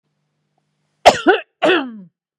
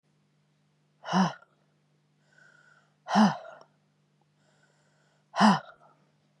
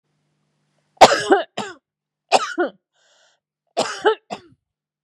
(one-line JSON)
{"cough_length": "2.4 s", "cough_amplitude": 32768, "cough_signal_mean_std_ratio": 0.34, "exhalation_length": "6.4 s", "exhalation_amplitude": 14996, "exhalation_signal_mean_std_ratio": 0.27, "three_cough_length": "5.0 s", "three_cough_amplitude": 32768, "three_cough_signal_mean_std_ratio": 0.29, "survey_phase": "beta (2021-08-13 to 2022-03-07)", "age": "45-64", "gender": "Female", "wearing_mask": "No", "symptom_none": true, "smoker_status": "Never smoked", "respiratory_condition_asthma": false, "respiratory_condition_other": false, "recruitment_source": "REACT", "submission_delay": "1 day", "covid_test_result": "Negative", "covid_test_method": "RT-qPCR", "influenza_a_test_result": "Negative", "influenza_b_test_result": "Negative"}